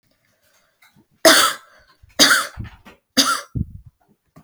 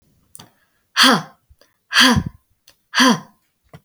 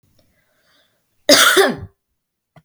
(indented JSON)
{
  "three_cough_length": "4.4 s",
  "three_cough_amplitude": 32768,
  "three_cough_signal_mean_std_ratio": 0.35,
  "exhalation_length": "3.8 s",
  "exhalation_amplitude": 32768,
  "exhalation_signal_mean_std_ratio": 0.37,
  "cough_length": "2.6 s",
  "cough_amplitude": 32767,
  "cough_signal_mean_std_ratio": 0.34,
  "survey_phase": "beta (2021-08-13 to 2022-03-07)",
  "age": "18-44",
  "gender": "Female",
  "wearing_mask": "No",
  "symptom_none": true,
  "smoker_status": "Never smoked",
  "respiratory_condition_asthma": false,
  "respiratory_condition_other": true,
  "recruitment_source": "REACT",
  "submission_delay": "2 days",
  "covid_test_result": "Negative",
  "covid_test_method": "RT-qPCR"
}